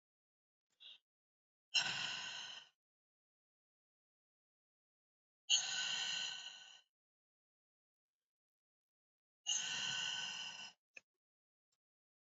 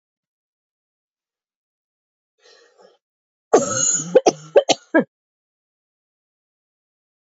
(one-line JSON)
{"exhalation_length": "12.2 s", "exhalation_amplitude": 3365, "exhalation_signal_mean_std_ratio": 0.37, "cough_length": "7.3 s", "cough_amplitude": 29166, "cough_signal_mean_std_ratio": 0.24, "survey_phase": "beta (2021-08-13 to 2022-03-07)", "age": "18-44", "gender": "Female", "wearing_mask": "No", "symptom_cough_any": true, "symptom_runny_or_blocked_nose": true, "symptom_fatigue": true, "symptom_headache": true, "symptom_change_to_sense_of_smell_or_taste": true, "symptom_onset": "12 days", "smoker_status": "Never smoked", "respiratory_condition_asthma": false, "respiratory_condition_other": false, "recruitment_source": "REACT", "submission_delay": "2 days", "covid_test_result": "Negative", "covid_test_method": "RT-qPCR"}